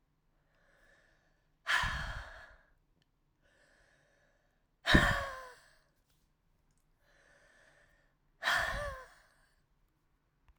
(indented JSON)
{
  "exhalation_length": "10.6 s",
  "exhalation_amplitude": 11183,
  "exhalation_signal_mean_std_ratio": 0.28,
  "survey_phase": "alpha (2021-03-01 to 2021-08-12)",
  "age": "18-44",
  "gender": "Female",
  "wearing_mask": "No",
  "symptom_cough_any": true,
  "symptom_fatigue": true,
  "symptom_fever_high_temperature": true,
  "symptom_change_to_sense_of_smell_or_taste": true,
  "symptom_onset": "2 days",
  "smoker_status": "Current smoker (e-cigarettes or vapes only)",
  "respiratory_condition_asthma": false,
  "respiratory_condition_other": false,
  "recruitment_source": "Test and Trace",
  "submission_delay": "2 days",
  "covid_test_result": "Positive",
  "covid_test_method": "RT-qPCR",
  "covid_ct_value": 31.3,
  "covid_ct_gene": "N gene"
}